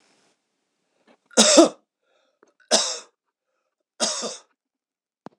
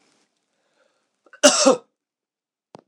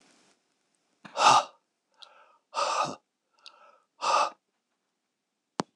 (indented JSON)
{
  "three_cough_length": "5.4 s",
  "three_cough_amplitude": 26028,
  "three_cough_signal_mean_std_ratio": 0.27,
  "cough_length": "2.9 s",
  "cough_amplitude": 26028,
  "cough_signal_mean_std_ratio": 0.25,
  "exhalation_length": "5.8 s",
  "exhalation_amplitude": 14619,
  "exhalation_signal_mean_std_ratio": 0.3,
  "survey_phase": "beta (2021-08-13 to 2022-03-07)",
  "age": "45-64",
  "gender": "Male",
  "wearing_mask": "No",
  "symptom_cough_any": true,
  "symptom_sore_throat": true,
  "symptom_fatigue": true,
  "symptom_onset": "4 days",
  "smoker_status": "Ex-smoker",
  "respiratory_condition_asthma": true,
  "respiratory_condition_other": false,
  "recruitment_source": "Test and Trace",
  "submission_delay": "1 day",
  "covid_test_result": "Positive",
  "covid_test_method": "RT-qPCR",
  "covid_ct_value": 14.9,
  "covid_ct_gene": "ORF1ab gene",
  "covid_ct_mean": 15.1,
  "covid_viral_load": "11000000 copies/ml",
  "covid_viral_load_category": "High viral load (>1M copies/ml)"
}